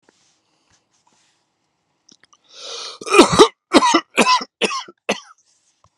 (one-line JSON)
{"cough_length": "6.0 s", "cough_amplitude": 32768, "cough_signal_mean_std_ratio": 0.32, "survey_phase": "beta (2021-08-13 to 2022-03-07)", "age": "65+", "gender": "Male", "wearing_mask": "No", "symptom_none": true, "smoker_status": "Current smoker (1 to 10 cigarettes per day)", "respiratory_condition_asthma": false, "respiratory_condition_other": false, "recruitment_source": "REACT", "submission_delay": "2 days", "covid_test_result": "Negative", "covid_test_method": "RT-qPCR"}